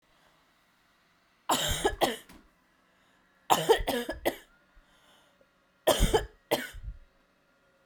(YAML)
three_cough_length: 7.9 s
three_cough_amplitude: 17827
three_cough_signal_mean_std_ratio: 0.36
survey_phase: beta (2021-08-13 to 2022-03-07)
age: 18-44
gender: Female
wearing_mask: 'No'
symptom_cough_any: true
symptom_new_continuous_cough: true
symptom_fatigue: true
symptom_headache: true
symptom_onset: 4 days
smoker_status: Never smoked
respiratory_condition_asthma: false
respiratory_condition_other: false
recruitment_source: Test and Trace
submission_delay: 2 days
covid_test_result: Positive
covid_test_method: RT-qPCR